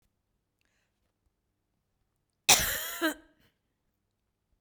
{"cough_length": "4.6 s", "cough_amplitude": 22427, "cough_signal_mean_std_ratio": 0.22, "survey_phase": "beta (2021-08-13 to 2022-03-07)", "age": "45-64", "gender": "Female", "wearing_mask": "No", "symptom_none": true, "smoker_status": "Never smoked", "respiratory_condition_asthma": false, "respiratory_condition_other": false, "recruitment_source": "REACT", "submission_delay": "2 days", "covid_test_result": "Negative", "covid_test_method": "RT-qPCR", "influenza_a_test_result": "Negative", "influenza_b_test_result": "Negative"}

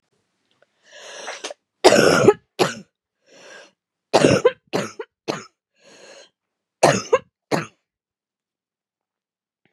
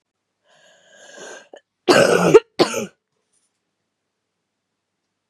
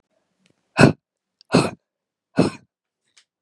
{"three_cough_length": "9.7 s", "three_cough_amplitude": 32768, "three_cough_signal_mean_std_ratio": 0.3, "cough_length": "5.3 s", "cough_amplitude": 32767, "cough_signal_mean_std_ratio": 0.27, "exhalation_length": "3.4 s", "exhalation_amplitude": 32768, "exhalation_signal_mean_std_ratio": 0.25, "survey_phase": "beta (2021-08-13 to 2022-03-07)", "age": "18-44", "gender": "Female", "wearing_mask": "No", "symptom_cough_any": true, "symptom_runny_or_blocked_nose": true, "symptom_fatigue": true, "symptom_onset": "3 days", "smoker_status": "Never smoked", "respiratory_condition_asthma": false, "respiratory_condition_other": false, "recruitment_source": "Test and Trace", "submission_delay": "2 days", "covid_test_result": "Positive", "covid_test_method": "RT-qPCR", "covid_ct_value": 23.3, "covid_ct_gene": "ORF1ab gene", "covid_ct_mean": 23.6, "covid_viral_load": "19000 copies/ml", "covid_viral_load_category": "Low viral load (10K-1M copies/ml)"}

